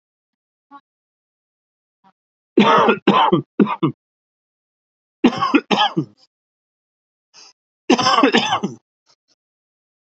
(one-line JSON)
{"three_cough_length": "10.1 s", "three_cough_amplitude": 32768, "three_cough_signal_mean_std_ratio": 0.37, "survey_phase": "alpha (2021-03-01 to 2021-08-12)", "age": "45-64", "gender": "Male", "wearing_mask": "No", "symptom_cough_any": true, "symptom_fatigue": true, "symptom_onset": "8 days", "smoker_status": "Ex-smoker", "respiratory_condition_asthma": false, "respiratory_condition_other": false, "recruitment_source": "REACT", "submission_delay": "1 day", "covid_test_result": "Negative", "covid_test_method": "RT-qPCR"}